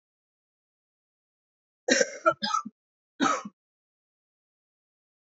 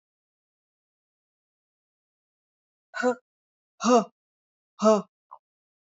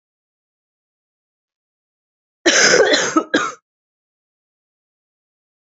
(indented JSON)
{
  "three_cough_length": "5.2 s",
  "three_cough_amplitude": 15946,
  "three_cough_signal_mean_std_ratio": 0.27,
  "exhalation_length": "6.0 s",
  "exhalation_amplitude": 13913,
  "exhalation_signal_mean_std_ratio": 0.23,
  "cough_length": "5.6 s",
  "cough_amplitude": 31845,
  "cough_signal_mean_std_ratio": 0.31,
  "survey_phase": "alpha (2021-03-01 to 2021-08-12)",
  "age": "45-64",
  "gender": "Female",
  "wearing_mask": "No",
  "symptom_cough_any": true,
  "symptom_shortness_of_breath": true,
  "symptom_fatigue": true,
  "symptom_headache": true,
  "smoker_status": "Current smoker (1 to 10 cigarettes per day)",
  "respiratory_condition_asthma": false,
  "respiratory_condition_other": false,
  "recruitment_source": "Test and Trace",
  "submission_delay": "1 day",
  "covid_test_result": "Positive",
  "covid_test_method": "RT-qPCR"
}